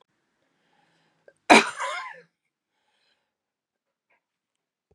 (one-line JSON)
{"cough_length": "4.9 s", "cough_amplitude": 32767, "cough_signal_mean_std_ratio": 0.17, "survey_phase": "beta (2021-08-13 to 2022-03-07)", "age": "65+", "gender": "Female", "wearing_mask": "No", "symptom_runny_or_blocked_nose": true, "symptom_sore_throat": true, "symptom_fatigue": true, "symptom_headache": true, "symptom_other": true, "symptom_onset": "3 days", "smoker_status": "Never smoked", "respiratory_condition_asthma": false, "respiratory_condition_other": false, "recruitment_source": "Test and Trace", "submission_delay": "1 day", "covid_test_result": "Positive", "covid_test_method": "RT-qPCR", "covid_ct_value": 17.7, "covid_ct_gene": "ORF1ab gene", "covid_ct_mean": 18.9, "covid_viral_load": "630000 copies/ml", "covid_viral_load_category": "Low viral load (10K-1M copies/ml)"}